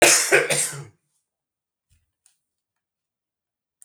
cough_length: 3.8 s
cough_amplitude: 30418
cough_signal_mean_std_ratio: 0.31
survey_phase: beta (2021-08-13 to 2022-03-07)
age: 45-64
gender: Male
wearing_mask: 'No'
symptom_cough_any: true
symptom_headache: true
smoker_status: Ex-smoker
respiratory_condition_asthma: false
respiratory_condition_other: false
recruitment_source: REACT
submission_delay: 4 days
covid_test_result: Negative
covid_test_method: RT-qPCR
influenza_a_test_result: Negative
influenza_b_test_result: Negative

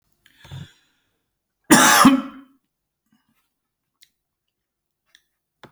cough_length: 5.7 s
cough_amplitude: 32279
cough_signal_mean_std_ratio: 0.25
survey_phase: beta (2021-08-13 to 2022-03-07)
age: 45-64
gender: Male
wearing_mask: 'No'
symptom_none: true
smoker_status: Ex-smoker
respiratory_condition_asthma: false
respiratory_condition_other: false
recruitment_source: REACT
submission_delay: 1 day
covid_test_result: Negative
covid_test_method: RT-qPCR
influenza_a_test_result: Negative
influenza_b_test_result: Negative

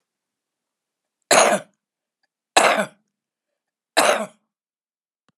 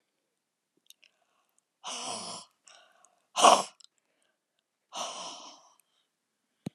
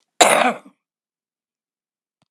three_cough_length: 5.4 s
three_cough_amplitude: 32767
three_cough_signal_mean_std_ratio: 0.3
exhalation_length: 6.7 s
exhalation_amplitude: 20292
exhalation_signal_mean_std_ratio: 0.21
cough_length: 2.3 s
cough_amplitude: 32768
cough_signal_mean_std_ratio: 0.29
survey_phase: beta (2021-08-13 to 2022-03-07)
age: 65+
gender: Female
wearing_mask: 'No'
symptom_cough_any: true
smoker_status: Ex-smoker
respiratory_condition_asthma: false
respiratory_condition_other: false
recruitment_source: REACT
submission_delay: 1 day
covid_test_result: Negative
covid_test_method: RT-qPCR
influenza_a_test_result: Negative
influenza_b_test_result: Negative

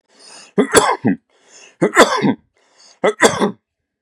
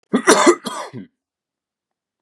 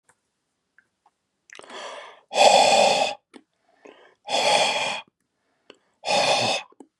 three_cough_length: 4.0 s
three_cough_amplitude: 32768
three_cough_signal_mean_std_ratio: 0.43
cough_length: 2.2 s
cough_amplitude: 32767
cough_signal_mean_std_ratio: 0.36
exhalation_length: 7.0 s
exhalation_amplitude: 24749
exhalation_signal_mean_std_ratio: 0.44
survey_phase: beta (2021-08-13 to 2022-03-07)
age: 18-44
gender: Male
wearing_mask: 'No'
symptom_none: true
smoker_status: Never smoked
respiratory_condition_asthma: false
respiratory_condition_other: false
recruitment_source: REACT
submission_delay: 1 day
covid_test_result: Negative
covid_test_method: RT-qPCR
influenza_a_test_result: Negative
influenza_b_test_result: Negative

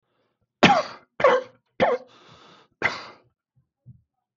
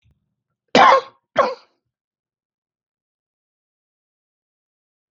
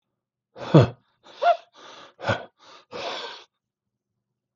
three_cough_length: 4.4 s
three_cough_amplitude: 32638
three_cough_signal_mean_std_ratio: 0.32
cough_length: 5.1 s
cough_amplitude: 32768
cough_signal_mean_std_ratio: 0.22
exhalation_length: 4.6 s
exhalation_amplitude: 30385
exhalation_signal_mean_std_ratio: 0.27
survey_phase: beta (2021-08-13 to 2022-03-07)
age: 45-64
gender: Male
wearing_mask: 'No'
symptom_none: true
smoker_status: Ex-smoker
respiratory_condition_asthma: false
respiratory_condition_other: false
recruitment_source: REACT
submission_delay: 0 days
covid_test_result: Negative
covid_test_method: RT-qPCR
influenza_a_test_result: Negative
influenza_b_test_result: Negative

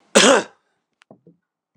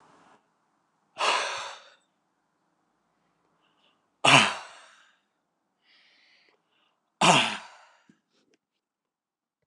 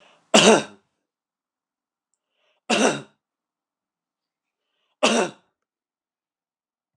cough_length: 1.8 s
cough_amplitude: 29204
cough_signal_mean_std_ratio: 0.31
exhalation_length: 9.7 s
exhalation_amplitude: 23939
exhalation_signal_mean_std_ratio: 0.24
three_cough_length: 7.0 s
three_cough_amplitude: 29204
three_cough_signal_mean_std_ratio: 0.25
survey_phase: beta (2021-08-13 to 2022-03-07)
age: 65+
gender: Male
wearing_mask: 'No'
symptom_cough_any: true
symptom_onset: 9 days
smoker_status: Never smoked
respiratory_condition_asthma: false
respiratory_condition_other: false
recruitment_source: Test and Trace
submission_delay: 2 days
covid_test_result: Positive
covid_test_method: RT-qPCR
covid_ct_value: 24.4
covid_ct_gene: ORF1ab gene
covid_ct_mean: 25.1
covid_viral_load: 5700 copies/ml
covid_viral_load_category: Minimal viral load (< 10K copies/ml)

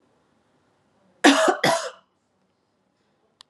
cough_length: 3.5 s
cough_amplitude: 30868
cough_signal_mean_std_ratio: 0.3
survey_phase: alpha (2021-03-01 to 2021-08-12)
age: 45-64
gender: Female
wearing_mask: 'Yes'
symptom_none: true
smoker_status: Ex-smoker
respiratory_condition_asthma: false
respiratory_condition_other: false
recruitment_source: Test and Trace
submission_delay: 0 days
covid_test_result: Negative
covid_test_method: LFT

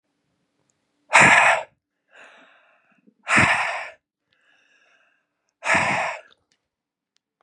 exhalation_length: 7.4 s
exhalation_amplitude: 30818
exhalation_signal_mean_std_ratio: 0.34
survey_phase: beta (2021-08-13 to 2022-03-07)
age: 45-64
gender: Male
wearing_mask: 'No'
symptom_none: true
smoker_status: Ex-smoker
respiratory_condition_asthma: true
respiratory_condition_other: false
recruitment_source: REACT
submission_delay: 3 days
covid_test_result: Negative
covid_test_method: RT-qPCR
influenza_a_test_result: Negative
influenza_b_test_result: Negative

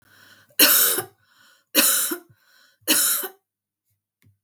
three_cough_length: 4.4 s
three_cough_amplitude: 32766
three_cough_signal_mean_std_ratio: 0.42
survey_phase: beta (2021-08-13 to 2022-03-07)
age: 45-64
gender: Female
wearing_mask: 'No'
symptom_none: true
smoker_status: Never smoked
respiratory_condition_asthma: false
respiratory_condition_other: false
recruitment_source: REACT
submission_delay: 2 days
covid_test_result: Negative
covid_test_method: RT-qPCR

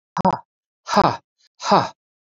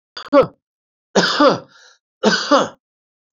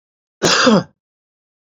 exhalation_length: 2.3 s
exhalation_amplitude: 27741
exhalation_signal_mean_std_ratio: 0.36
three_cough_length: 3.3 s
three_cough_amplitude: 28960
three_cough_signal_mean_std_ratio: 0.41
cough_length: 1.6 s
cough_amplitude: 29827
cough_signal_mean_std_ratio: 0.41
survey_phase: beta (2021-08-13 to 2022-03-07)
age: 65+
gender: Male
wearing_mask: 'No'
symptom_none: true
smoker_status: Never smoked
respiratory_condition_asthma: false
respiratory_condition_other: false
recruitment_source: REACT
submission_delay: 2 days
covid_test_result: Negative
covid_test_method: RT-qPCR
influenza_a_test_result: Negative
influenza_b_test_result: Negative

